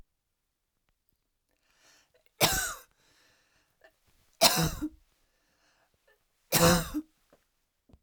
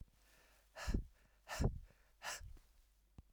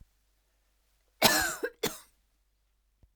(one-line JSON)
{"three_cough_length": "8.0 s", "three_cough_amplitude": 16353, "three_cough_signal_mean_std_ratio": 0.28, "exhalation_length": "3.3 s", "exhalation_amplitude": 2686, "exhalation_signal_mean_std_ratio": 0.39, "cough_length": "3.2 s", "cough_amplitude": 15640, "cough_signal_mean_std_ratio": 0.29, "survey_phase": "alpha (2021-03-01 to 2021-08-12)", "age": "45-64", "gender": "Female", "wearing_mask": "No", "symptom_none": true, "smoker_status": "Ex-smoker", "respiratory_condition_asthma": false, "respiratory_condition_other": true, "recruitment_source": "REACT", "submission_delay": "2 days", "covid_test_result": "Negative", "covid_test_method": "RT-qPCR"}